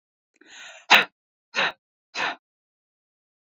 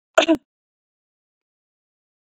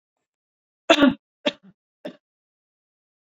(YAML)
exhalation_length: 3.4 s
exhalation_amplitude: 27808
exhalation_signal_mean_std_ratio: 0.25
cough_length: 2.3 s
cough_amplitude: 27095
cough_signal_mean_std_ratio: 0.2
three_cough_length: 3.3 s
three_cough_amplitude: 26644
three_cough_signal_mean_std_ratio: 0.22
survey_phase: beta (2021-08-13 to 2022-03-07)
age: 45-64
gender: Female
wearing_mask: 'No'
symptom_none: true
smoker_status: Never smoked
respiratory_condition_asthma: false
respiratory_condition_other: false
recruitment_source: REACT
submission_delay: 1 day
covid_test_result: Negative
covid_test_method: RT-qPCR